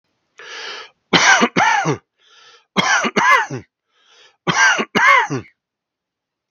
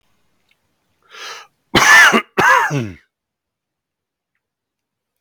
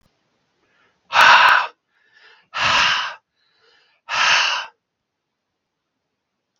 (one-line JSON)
{"three_cough_length": "6.5 s", "three_cough_amplitude": 32768, "three_cough_signal_mean_std_ratio": 0.49, "cough_length": "5.2 s", "cough_amplitude": 32767, "cough_signal_mean_std_ratio": 0.34, "exhalation_length": "6.6 s", "exhalation_amplitude": 32761, "exhalation_signal_mean_std_ratio": 0.38, "survey_phase": "beta (2021-08-13 to 2022-03-07)", "age": "45-64", "gender": "Male", "wearing_mask": "No", "symptom_none": true, "smoker_status": "Ex-smoker", "respiratory_condition_asthma": true, "respiratory_condition_other": false, "recruitment_source": "REACT", "submission_delay": "5 days", "covid_test_result": "Negative", "covid_test_method": "RT-qPCR", "influenza_a_test_result": "Negative", "influenza_b_test_result": "Negative"}